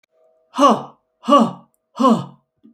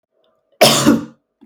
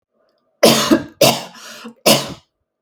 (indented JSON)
{
  "exhalation_length": "2.7 s",
  "exhalation_amplitude": 32766,
  "exhalation_signal_mean_std_ratio": 0.41,
  "cough_length": "1.5 s",
  "cough_amplitude": 32768,
  "cough_signal_mean_std_ratio": 0.43,
  "three_cough_length": "2.8 s",
  "three_cough_amplitude": 32768,
  "three_cough_signal_mean_std_ratio": 0.42,
  "survey_phase": "beta (2021-08-13 to 2022-03-07)",
  "age": "45-64",
  "gender": "Female",
  "wearing_mask": "No",
  "symptom_sore_throat": true,
  "symptom_onset": "8 days",
  "smoker_status": "Never smoked",
  "respiratory_condition_asthma": false,
  "respiratory_condition_other": false,
  "recruitment_source": "REACT",
  "submission_delay": "1 day",
  "covid_test_result": "Negative",
  "covid_test_method": "RT-qPCR",
  "influenza_a_test_result": "Negative",
  "influenza_b_test_result": "Negative"
}